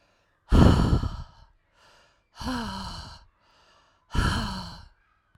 {"exhalation_length": "5.4 s", "exhalation_amplitude": 20371, "exhalation_signal_mean_std_ratio": 0.39, "survey_phase": "alpha (2021-03-01 to 2021-08-12)", "age": "18-44", "gender": "Female", "wearing_mask": "No", "symptom_none": true, "smoker_status": "Never smoked", "respiratory_condition_asthma": false, "respiratory_condition_other": false, "recruitment_source": "REACT", "submission_delay": "2 days", "covid_test_result": "Negative", "covid_test_method": "RT-qPCR"}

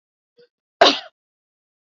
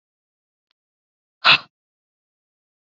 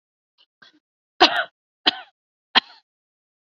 {"cough_length": "2.0 s", "cough_amplitude": 27676, "cough_signal_mean_std_ratio": 0.2, "exhalation_length": "2.8 s", "exhalation_amplitude": 30730, "exhalation_signal_mean_std_ratio": 0.16, "three_cough_length": "3.4 s", "three_cough_amplitude": 30397, "three_cough_signal_mean_std_ratio": 0.21, "survey_phase": "beta (2021-08-13 to 2022-03-07)", "age": "45-64", "gender": "Female", "wearing_mask": "No", "symptom_none": true, "smoker_status": "Never smoked", "respiratory_condition_asthma": false, "respiratory_condition_other": false, "recruitment_source": "REACT", "submission_delay": "3 days", "covid_test_result": "Negative", "covid_test_method": "RT-qPCR", "influenza_a_test_result": "Negative", "influenza_b_test_result": "Negative"}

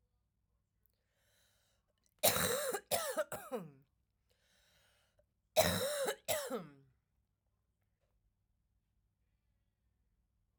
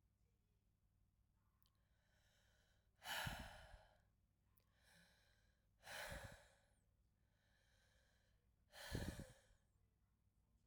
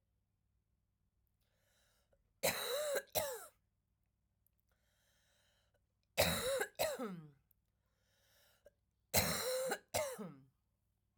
{"cough_length": "10.6 s", "cough_amplitude": 5252, "cough_signal_mean_std_ratio": 0.33, "exhalation_length": "10.7 s", "exhalation_amplitude": 781, "exhalation_signal_mean_std_ratio": 0.36, "three_cough_length": "11.2 s", "three_cough_amplitude": 4460, "three_cough_signal_mean_std_ratio": 0.39, "survey_phase": "alpha (2021-03-01 to 2021-08-12)", "age": "18-44", "gender": "Female", "wearing_mask": "No", "symptom_cough_any": true, "symptom_shortness_of_breath": true, "symptom_fatigue": true, "smoker_status": "Never smoked", "respiratory_condition_asthma": false, "respiratory_condition_other": false, "recruitment_source": "REACT", "submission_delay": "10 days", "covid_test_result": "Negative", "covid_test_method": "RT-qPCR"}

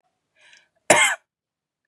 {"cough_length": "1.9 s", "cough_amplitude": 32767, "cough_signal_mean_std_ratio": 0.28, "survey_phase": "beta (2021-08-13 to 2022-03-07)", "age": "18-44", "gender": "Female", "wearing_mask": "No", "symptom_none": true, "smoker_status": "Never smoked", "respiratory_condition_asthma": false, "respiratory_condition_other": false, "recruitment_source": "REACT", "submission_delay": "1 day", "covid_test_result": "Negative", "covid_test_method": "RT-qPCR", "influenza_a_test_result": "Negative", "influenza_b_test_result": "Negative"}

